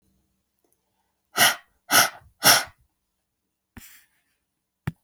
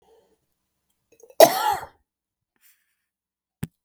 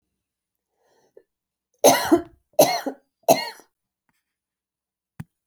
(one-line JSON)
{"exhalation_length": "5.0 s", "exhalation_amplitude": 27110, "exhalation_signal_mean_std_ratio": 0.26, "cough_length": "3.8 s", "cough_amplitude": 31801, "cough_signal_mean_std_ratio": 0.19, "three_cough_length": "5.5 s", "three_cough_amplitude": 29464, "three_cough_signal_mean_std_ratio": 0.26, "survey_phase": "alpha (2021-03-01 to 2021-08-12)", "age": "65+", "gender": "Female", "wearing_mask": "No", "symptom_none": true, "symptom_onset": "5 days", "smoker_status": "Never smoked", "respiratory_condition_asthma": false, "respiratory_condition_other": false, "recruitment_source": "REACT", "submission_delay": "2 days", "covid_test_result": "Negative", "covid_test_method": "RT-qPCR"}